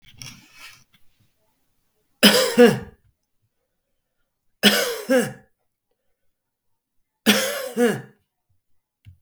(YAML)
three_cough_length: 9.2 s
three_cough_amplitude: 32766
three_cough_signal_mean_std_ratio: 0.31
survey_phase: beta (2021-08-13 to 2022-03-07)
age: 45-64
gender: Male
wearing_mask: 'No'
symptom_none: true
smoker_status: Never smoked
respiratory_condition_asthma: false
respiratory_condition_other: true
recruitment_source: REACT
submission_delay: 1 day
covid_test_result: Negative
covid_test_method: RT-qPCR
influenza_a_test_result: Negative
influenza_b_test_result: Negative